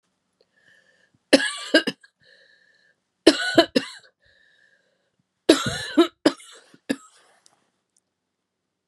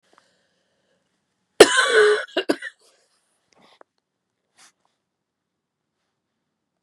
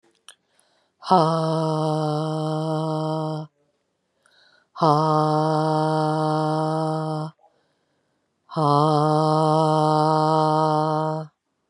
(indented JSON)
{
  "three_cough_length": "8.9 s",
  "three_cough_amplitude": 32767,
  "three_cough_signal_mean_std_ratio": 0.25,
  "cough_length": "6.8 s",
  "cough_amplitude": 32768,
  "cough_signal_mean_std_ratio": 0.22,
  "exhalation_length": "11.7 s",
  "exhalation_amplitude": 23260,
  "exhalation_signal_mean_std_ratio": 0.62,
  "survey_phase": "beta (2021-08-13 to 2022-03-07)",
  "age": "45-64",
  "gender": "Female",
  "wearing_mask": "No",
  "symptom_cough_any": true,
  "symptom_runny_or_blocked_nose": true,
  "symptom_sore_throat": true,
  "symptom_fatigue": true,
  "symptom_headache": true,
  "smoker_status": "Never smoked",
  "respiratory_condition_asthma": false,
  "respiratory_condition_other": false,
  "recruitment_source": "Test and Trace",
  "submission_delay": "0 days",
  "covid_test_result": "Positive",
  "covid_test_method": "LFT"
}